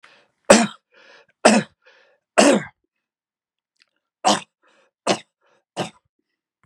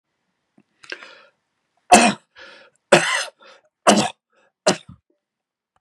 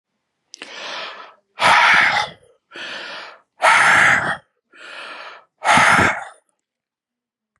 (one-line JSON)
{"three_cough_length": "6.7 s", "three_cough_amplitude": 32768, "three_cough_signal_mean_std_ratio": 0.27, "cough_length": "5.8 s", "cough_amplitude": 32768, "cough_signal_mean_std_ratio": 0.28, "exhalation_length": "7.6 s", "exhalation_amplitude": 28681, "exhalation_signal_mean_std_ratio": 0.47, "survey_phase": "beta (2021-08-13 to 2022-03-07)", "age": "65+", "gender": "Male", "wearing_mask": "No", "symptom_none": true, "smoker_status": "Ex-smoker", "respiratory_condition_asthma": false, "respiratory_condition_other": false, "recruitment_source": "REACT", "submission_delay": "1 day", "covid_test_result": "Negative", "covid_test_method": "RT-qPCR", "influenza_a_test_result": "Unknown/Void", "influenza_b_test_result": "Unknown/Void"}